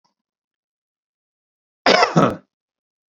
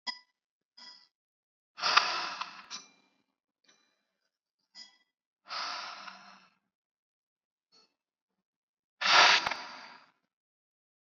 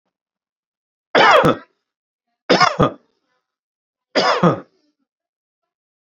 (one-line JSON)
{"cough_length": "3.2 s", "cough_amplitude": 28490, "cough_signal_mean_std_ratio": 0.28, "exhalation_length": "11.2 s", "exhalation_amplitude": 16216, "exhalation_signal_mean_std_ratio": 0.25, "three_cough_length": "6.1 s", "three_cough_amplitude": 30019, "three_cough_signal_mean_std_ratio": 0.34, "survey_phase": "beta (2021-08-13 to 2022-03-07)", "age": "45-64", "gender": "Male", "wearing_mask": "No", "symptom_none": true, "smoker_status": "Never smoked", "respiratory_condition_asthma": true, "respiratory_condition_other": false, "recruitment_source": "Test and Trace", "submission_delay": "2 days", "covid_test_result": "Negative", "covid_test_method": "RT-qPCR"}